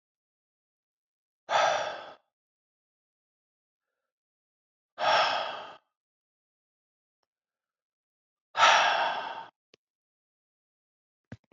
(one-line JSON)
{"exhalation_length": "11.5 s", "exhalation_amplitude": 12789, "exhalation_signal_mean_std_ratio": 0.3, "survey_phase": "beta (2021-08-13 to 2022-03-07)", "age": "45-64", "gender": "Male", "wearing_mask": "No", "symptom_cough_any": true, "symptom_runny_or_blocked_nose": true, "symptom_sore_throat": true, "symptom_fatigue": true, "symptom_headache": true, "symptom_onset": "3 days", "smoker_status": "Never smoked", "respiratory_condition_asthma": false, "respiratory_condition_other": false, "recruitment_source": "Test and Trace", "submission_delay": "1 day", "covid_test_result": "Positive", "covid_test_method": "RT-qPCR", "covid_ct_value": 12.7, "covid_ct_gene": "N gene", "covid_ct_mean": 13.2, "covid_viral_load": "48000000 copies/ml", "covid_viral_load_category": "High viral load (>1M copies/ml)"}